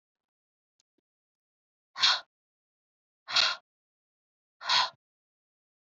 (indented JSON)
{
  "exhalation_length": "5.8 s",
  "exhalation_amplitude": 9552,
  "exhalation_signal_mean_std_ratio": 0.25,
  "survey_phase": "beta (2021-08-13 to 2022-03-07)",
  "age": "18-44",
  "gender": "Female",
  "wearing_mask": "No",
  "symptom_none": true,
  "symptom_onset": "10 days",
  "smoker_status": "Never smoked",
  "respiratory_condition_asthma": true,
  "respiratory_condition_other": false,
  "recruitment_source": "REACT",
  "submission_delay": "1 day",
  "covid_test_result": "Negative",
  "covid_test_method": "RT-qPCR",
  "influenza_a_test_result": "Negative",
  "influenza_b_test_result": "Negative"
}